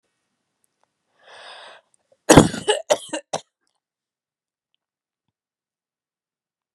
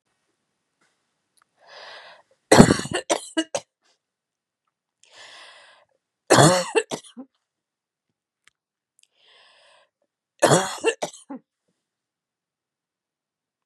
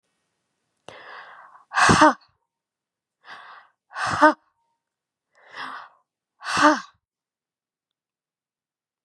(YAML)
cough_length: 6.7 s
cough_amplitude: 32768
cough_signal_mean_std_ratio: 0.18
three_cough_length: 13.7 s
three_cough_amplitude: 32768
three_cough_signal_mean_std_ratio: 0.23
exhalation_length: 9.0 s
exhalation_amplitude: 28130
exhalation_signal_mean_std_ratio: 0.26
survey_phase: beta (2021-08-13 to 2022-03-07)
age: 45-64
gender: Female
wearing_mask: 'No'
symptom_none: true
smoker_status: Never smoked
respiratory_condition_asthma: false
respiratory_condition_other: false
recruitment_source: REACT
submission_delay: 1 day
covid_test_result: Negative
covid_test_method: RT-qPCR
influenza_a_test_result: Negative
influenza_b_test_result: Negative